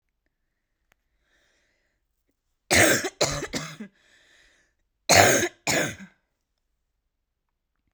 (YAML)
cough_length: 7.9 s
cough_amplitude: 32768
cough_signal_mean_std_ratio: 0.3
survey_phase: beta (2021-08-13 to 2022-03-07)
age: 18-44
gender: Female
wearing_mask: 'No'
symptom_cough_any: true
symptom_new_continuous_cough: true
symptom_runny_or_blocked_nose: true
symptom_sore_throat: true
symptom_abdominal_pain: true
symptom_fatigue: true
symptom_onset: 5 days
smoker_status: Ex-smoker
respiratory_condition_asthma: false
respiratory_condition_other: false
recruitment_source: Test and Trace
submission_delay: 2 days
covid_test_result: Positive
covid_test_method: RT-qPCR
covid_ct_value: 28.6
covid_ct_gene: ORF1ab gene
covid_ct_mean: 29.1
covid_viral_load: 290 copies/ml
covid_viral_load_category: Minimal viral load (< 10K copies/ml)